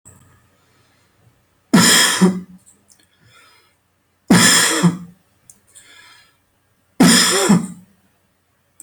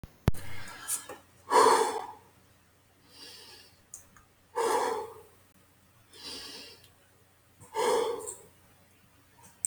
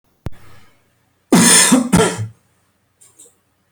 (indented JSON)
{
  "three_cough_length": "8.8 s",
  "three_cough_amplitude": 32767,
  "three_cough_signal_mean_std_ratio": 0.4,
  "exhalation_length": "9.7 s",
  "exhalation_amplitude": 11775,
  "exhalation_signal_mean_std_ratio": 0.4,
  "cough_length": "3.7 s",
  "cough_amplitude": 32768,
  "cough_signal_mean_std_ratio": 0.41,
  "survey_phase": "beta (2021-08-13 to 2022-03-07)",
  "age": "18-44",
  "gender": "Male",
  "wearing_mask": "No",
  "symptom_diarrhoea": true,
  "symptom_fatigue": true,
  "smoker_status": "Never smoked",
  "respiratory_condition_asthma": false,
  "respiratory_condition_other": false,
  "recruitment_source": "REACT",
  "submission_delay": "1 day",
  "covid_test_result": "Negative",
  "covid_test_method": "RT-qPCR"
}